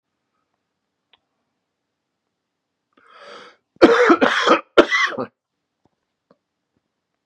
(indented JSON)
{
  "three_cough_length": "7.3 s",
  "three_cough_amplitude": 32768,
  "three_cough_signal_mean_std_ratio": 0.29,
  "survey_phase": "beta (2021-08-13 to 2022-03-07)",
  "age": "45-64",
  "gender": "Male",
  "wearing_mask": "No",
  "symptom_cough_any": true,
  "symptom_runny_or_blocked_nose": true,
  "symptom_shortness_of_breath": true,
  "symptom_headache": true,
  "symptom_onset": "2 days",
  "smoker_status": "Current smoker (11 or more cigarettes per day)",
  "respiratory_condition_asthma": false,
  "respiratory_condition_other": false,
  "recruitment_source": "Test and Trace",
  "submission_delay": "1 day",
  "covid_test_result": "Negative",
  "covid_test_method": "RT-qPCR"
}